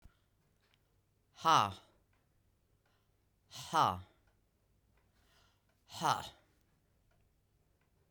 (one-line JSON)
{"exhalation_length": "8.1 s", "exhalation_amplitude": 5936, "exhalation_signal_mean_std_ratio": 0.23, "survey_phase": "beta (2021-08-13 to 2022-03-07)", "age": "45-64", "gender": "Female", "wearing_mask": "No", "symptom_new_continuous_cough": true, "symptom_runny_or_blocked_nose": true, "symptom_shortness_of_breath": true, "symptom_fatigue": true, "symptom_fever_high_temperature": true, "symptom_headache": true, "symptom_onset": "3 days", "smoker_status": "Never smoked", "respiratory_condition_asthma": false, "respiratory_condition_other": false, "recruitment_source": "Test and Trace", "submission_delay": "1 day", "covid_test_result": "Positive", "covid_test_method": "RT-qPCR", "covid_ct_value": 23.2, "covid_ct_gene": "ORF1ab gene"}